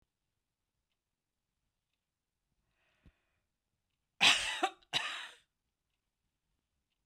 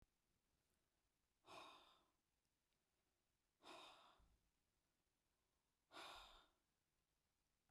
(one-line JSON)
{"cough_length": "7.1 s", "cough_amplitude": 7855, "cough_signal_mean_std_ratio": 0.21, "exhalation_length": "7.7 s", "exhalation_amplitude": 137, "exhalation_signal_mean_std_ratio": 0.41, "survey_phase": "beta (2021-08-13 to 2022-03-07)", "age": "65+", "gender": "Female", "wearing_mask": "No", "symptom_none": true, "smoker_status": "Never smoked", "respiratory_condition_asthma": false, "respiratory_condition_other": false, "recruitment_source": "REACT", "submission_delay": "1 day", "covid_test_result": "Negative", "covid_test_method": "RT-qPCR"}